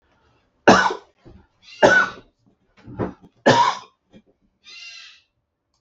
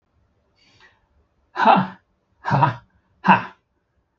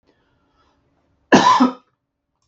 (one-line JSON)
{"three_cough_length": "5.8 s", "three_cough_amplitude": 32768, "three_cough_signal_mean_std_ratio": 0.32, "exhalation_length": "4.2 s", "exhalation_amplitude": 32767, "exhalation_signal_mean_std_ratio": 0.32, "cough_length": "2.5 s", "cough_amplitude": 32768, "cough_signal_mean_std_ratio": 0.32, "survey_phase": "beta (2021-08-13 to 2022-03-07)", "age": "65+", "gender": "Male", "wearing_mask": "No", "symptom_none": true, "smoker_status": "Never smoked", "respiratory_condition_asthma": false, "respiratory_condition_other": false, "recruitment_source": "REACT", "submission_delay": "1 day", "covid_test_result": "Negative", "covid_test_method": "RT-qPCR", "influenza_a_test_result": "Negative", "influenza_b_test_result": "Negative"}